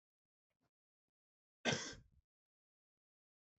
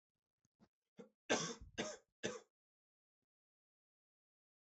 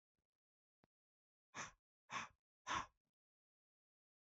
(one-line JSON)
{"cough_length": "3.6 s", "cough_amplitude": 2542, "cough_signal_mean_std_ratio": 0.2, "three_cough_length": "4.8 s", "three_cough_amplitude": 2265, "three_cough_signal_mean_std_ratio": 0.25, "exhalation_length": "4.3 s", "exhalation_amplitude": 877, "exhalation_signal_mean_std_ratio": 0.25, "survey_phase": "beta (2021-08-13 to 2022-03-07)", "age": "18-44", "gender": "Male", "wearing_mask": "No", "symptom_cough_any": true, "symptom_runny_or_blocked_nose": true, "symptom_shortness_of_breath": true, "symptom_sore_throat": true, "symptom_fatigue": true, "symptom_headache": true, "smoker_status": "Never smoked", "respiratory_condition_asthma": false, "respiratory_condition_other": false, "recruitment_source": "Test and Trace", "submission_delay": "2 days", "covid_test_result": "Positive", "covid_test_method": "RT-qPCR", "covid_ct_value": 26.3, "covid_ct_gene": "N gene"}